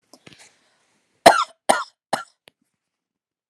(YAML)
three_cough_length: 3.5 s
three_cough_amplitude: 32768
three_cough_signal_mean_std_ratio: 0.2
survey_phase: alpha (2021-03-01 to 2021-08-12)
age: 45-64
gender: Female
wearing_mask: 'No'
symptom_none: true
smoker_status: Never smoked
respiratory_condition_asthma: false
respiratory_condition_other: false
recruitment_source: REACT
submission_delay: 1 day
covid_test_result: Negative
covid_test_method: RT-qPCR